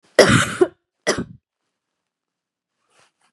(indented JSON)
{
  "cough_length": "3.3 s",
  "cough_amplitude": 32768,
  "cough_signal_mean_std_ratio": 0.29,
  "survey_phase": "beta (2021-08-13 to 2022-03-07)",
  "age": "18-44",
  "gender": "Female",
  "wearing_mask": "No",
  "symptom_cough_any": true,
  "symptom_runny_or_blocked_nose": true,
  "symptom_shortness_of_breath": true,
  "symptom_sore_throat": true,
  "symptom_fatigue": true,
  "symptom_onset": "4 days",
  "smoker_status": "Never smoked",
  "respiratory_condition_asthma": false,
  "respiratory_condition_other": false,
  "recruitment_source": "Test and Trace",
  "submission_delay": "2 days",
  "covid_test_result": "Positive",
  "covid_test_method": "RT-qPCR",
  "covid_ct_value": 17.1,
  "covid_ct_gene": "ORF1ab gene",
  "covid_ct_mean": 17.4,
  "covid_viral_load": "1900000 copies/ml",
  "covid_viral_load_category": "High viral load (>1M copies/ml)"
}